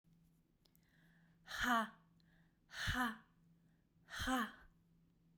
{"exhalation_length": "5.4 s", "exhalation_amplitude": 1834, "exhalation_signal_mean_std_ratio": 0.39, "survey_phase": "beta (2021-08-13 to 2022-03-07)", "age": "18-44", "gender": "Female", "wearing_mask": "No", "symptom_none": true, "smoker_status": "Never smoked", "respiratory_condition_asthma": true, "respiratory_condition_other": false, "recruitment_source": "REACT", "submission_delay": "1 day", "covid_test_result": "Negative", "covid_test_method": "RT-qPCR"}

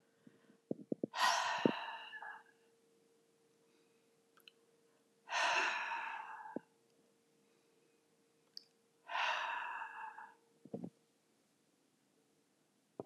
{"exhalation_length": "13.1 s", "exhalation_amplitude": 5488, "exhalation_signal_mean_std_ratio": 0.39, "survey_phase": "alpha (2021-03-01 to 2021-08-12)", "age": "65+", "gender": "Female", "wearing_mask": "No", "symptom_cough_any": true, "smoker_status": "Never smoked", "respiratory_condition_asthma": false, "respiratory_condition_other": false, "recruitment_source": "Test and Trace", "submission_delay": "0 days", "covid_test_result": "Negative", "covid_test_method": "LFT"}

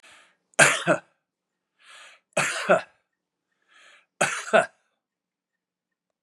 {"three_cough_length": "6.2 s", "three_cough_amplitude": 25720, "three_cough_signal_mean_std_ratio": 0.29, "survey_phase": "beta (2021-08-13 to 2022-03-07)", "age": "65+", "gender": "Male", "wearing_mask": "No", "symptom_none": true, "smoker_status": "Never smoked", "respiratory_condition_asthma": false, "respiratory_condition_other": false, "recruitment_source": "REACT", "submission_delay": "3 days", "covid_test_result": "Negative", "covid_test_method": "RT-qPCR", "influenza_a_test_result": "Negative", "influenza_b_test_result": "Negative"}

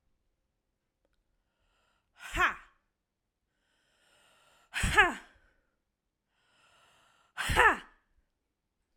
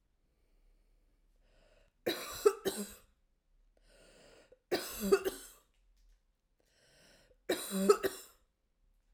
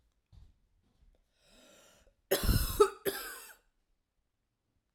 {"exhalation_length": "9.0 s", "exhalation_amplitude": 13496, "exhalation_signal_mean_std_ratio": 0.24, "three_cough_length": "9.1 s", "three_cough_amplitude": 9381, "three_cough_signal_mean_std_ratio": 0.29, "cough_length": "4.9 s", "cough_amplitude": 8863, "cough_signal_mean_std_ratio": 0.29, "survey_phase": "alpha (2021-03-01 to 2021-08-12)", "age": "18-44", "gender": "Female", "wearing_mask": "No", "symptom_cough_any": true, "symptom_fatigue": true, "symptom_change_to_sense_of_smell_or_taste": true, "symptom_onset": "8 days", "smoker_status": "Never smoked", "respiratory_condition_asthma": false, "respiratory_condition_other": false, "recruitment_source": "Test and Trace", "submission_delay": "2 days", "covid_test_result": "Positive", "covid_test_method": "RT-qPCR", "covid_ct_value": 23.2, "covid_ct_gene": "ORF1ab gene", "covid_ct_mean": 24.1, "covid_viral_load": "12000 copies/ml", "covid_viral_load_category": "Low viral load (10K-1M copies/ml)"}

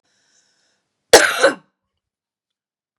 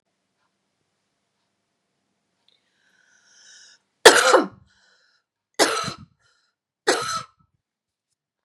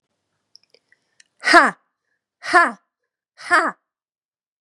{"cough_length": "3.0 s", "cough_amplitude": 32768, "cough_signal_mean_std_ratio": 0.24, "three_cough_length": "8.4 s", "three_cough_amplitude": 32768, "three_cough_signal_mean_std_ratio": 0.22, "exhalation_length": "4.6 s", "exhalation_amplitude": 32768, "exhalation_signal_mean_std_ratio": 0.27, "survey_phase": "beta (2021-08-13 to 2022-03-07)", "age": "45-64", "gender": "Female", "wearing_mask": "No", "symptom_cough_any": true, "symptom_runny_or_blocked_nose": true, "symptom_sore_throat": true, "symptom_fatigue": true, "symptom_other": true, "smoker_status": "Never smoked", "respiratory_condition_asthma": true, "respiratory_condition_other": false, "recruitment_source": "Test and Trace", "submission_delay": "2 days", "covid_test_result": "Positive", "covid_test_method": "LFT"}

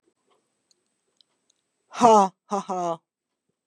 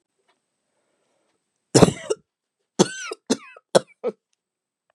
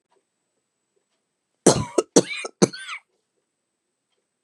{"exhalation_length": "3.7 s", "exhalation_amplitude": 28782, "exhalation_signal_mean_std_ratio": 0.28, "three_cough_length": "4.9 s", "three_cough_amplitude": 32767, "three_cough_signal_mean_std_ratio": 0.21, "cough_length": "4.4 s", "cough_amplitude": 31926, "cough_signal_mean_std_ratio": 0.22, "survey_phase": "beta (2021-08-13 to 2022-03-07)", "age": "45-64", "gender": "Female", "wearing_mask": "No", "symptom_sore_throat": true, "symptom_fatigue": true, "symptom_headache": true, "symptom_change_to_sense_of_smell_or_taste": true, "symptom_onset": "3 days", "smoker_status": "Never smoked", "respiratory_condition_asthma": false, "respiratory_condition_other": false, "recruitment_source": "Test and Trace", "submission_delay": "2 days", "covid_test_result": "Positive", "covid_test_method": "RT-qPCR", "covid_ct_value": 31.6, "covid_ct_gene": "N gene"}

